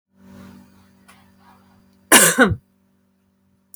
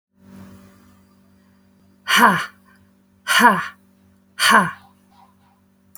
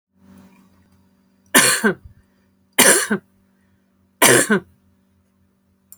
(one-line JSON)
{"cough_length": "3.8 s", "cough_amplitude": 32768, "cough_signal_mean_std_ratio": 0.27, "exhalation_length": "6.0 s", "exhalation_amplitude": 29994, "exhalation_signal_mean_std_ratio": 0.34, "three_cough_length": "6.0 s", "three_cough_amplitude": 32768, "three_cough_signal_mean_std_ratio": 0.33, "survey_phase": "beta (2021-08-13 to 2022-03-07)", "age": "45-64", "gender": "Female", "wearing_mask": "No", "symptom_none": true, "smoker_status": "Never smoked", "respiratory_condition_asthma": false, "respiratory_condition_other": false, "recruitment_source": "REACT", "submission_delay": "1 day", "covid_test_result": "Negative", "covid_test_method": "RT-qPCR"}